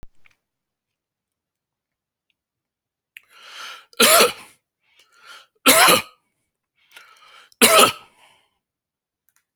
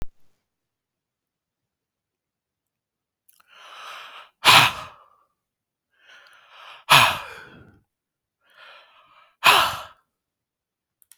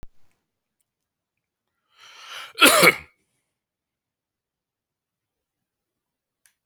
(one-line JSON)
{"three_cough_length": "9.6 s", "three_cough_amplitude": 32767, "three_cough_signal_mean_std_ratio": 0.27, "exhalation_length": "11.2 s", "exhalation_amplitude": 32450, "exhalation_signal_mean_std_ratio": 0.23, "cough_length": "6.7 s", "cough_amplitude": 31367, "cough_signal_mean_std_ratio": 0.19, "survey_phase": "alpha (2021-03-01 to 2021-08-12)", "age": "45-64", "gender": "Male", "wearing_mask": "No", "symptom_none": true, "smoker_status": "Ex-smoker", "respiratory_condition_asthma": false, "respiratory_condition_other": false, "recruitment_source": "REACT", "submission_delay": "10 days", "covid_test_result": "Negative", "covid_test_method": "RT-qPCR"}